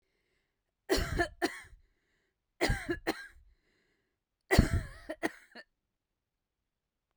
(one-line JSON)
{"three_cough_length": "7.2 s", "three_cough_amplitude": 13818, "three_cough_signal_mean_std_ratio": 0.31, "survey_phase": "beta (2021-08-13 to 2022-03-07)", "age": "18-44", "gender": "Female", "wearing_mask": "No", "symptom_none": true, "smoker_status": "Never smoked", "respiratory_condition_asthma": false, "respiratory_condition_other": false, "recruitment_source": "REACT", "submission_delay": "2 days", "covid_test_result": "Negative", "covid_test_method": "RT-qPCR"}